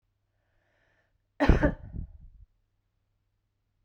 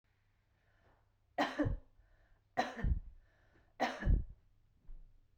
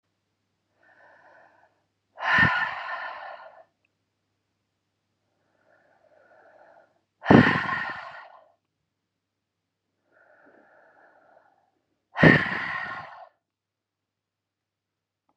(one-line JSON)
{"cough_length": "3.8 s", "cough_amplitude": 20409, "cough_signal_mean_std_ratio": 0.23, "three_cough_length": "5.4 s", "three_cough_amplitude": 3637, "three_cough_signal_mean_std_ratio": 0.39, "exhalation_length": "15.4 s", "exhalation_amplitude": 31080, "exhalation_signal_mean_std_ratio": 0.25, "survey_phase": "beta (2021-08-13 to 2022-03-07)", "age": "45-64", "gender": "Female", "wearing_mask": "No", "symptom_none": true, "smoker_status": "Ex-smoker", "respiratory_condition_asthma": false, "respiratory_condition_other": false, "recruitment_source": "REACT", "submission_delay": "1 day", "covid_test_result": "Negative", "covid_test_method": "RT-qPCR"}